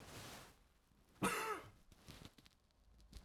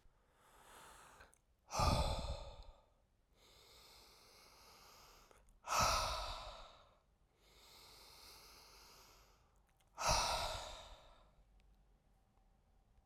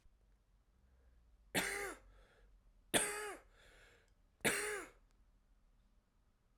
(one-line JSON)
{"cough_length": "3.2 s", "cough_amplitude": 2038, "cough_signal_mean_std_ratio": 0.43, "exhalation_length": "13.1 s", "exhalation_amplitude": 2774, "exhalation_signal_mean_std_ratio": 0.38, "three_cough_length": "6.6 s", "three_cough_amplitude": 4646, "three_cough_signal_mean_std_ratio": 0.36, "survey_phase": "alpha (2021-03-01 to 2021-08-12)", "age": "18-44", "gender": "Male", "wearing_mask": "No", "symptom_cough_any": true, "symptom_fatigue": true, "symptom_fever_high_temperature": true, "symptom_headache": true, "symptom_loss_of_taste": true, "symptom_onset": "4 days", "smoker_status": "Never smoked", "respiratory_condition_asthma": true, "respiratory_condition_other": false, "recruitment_source": "Test and Trace", "submission_delay": "2 days", "covid_test_result": "Positive", "covid_test_method": "RT-qPCR", "covid_ct_value": 18.4, "covid_ct_gene": "ORF1ab gene"}